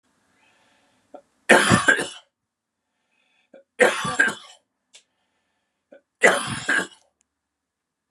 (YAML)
three_cough_length: 8.1 s
three_cough_amplitude: 31549
three_cough_signal_mean_std_ratio: 0.31
survey_phase: beta (2021-08-13 to 2022-03-07)
age: 45-64
gender: Male
wearing_mask: 'No'
symptom_cough_any: true
symptom_runny_or_blocked_nose: true
symptom_sore_throat: true
symptom_fatigue: true
smoker_status: Never smoked
respiratory_condition_asthma: false
respiratory_condition_other: false
recruitment_source: REACT
submission_delay: 2 days
covid_test_result: Negative
covid_test_method: RT-qPCR
influenza_a_test_result: Unknown/Void
influenza_b_test_result: Unknown/Void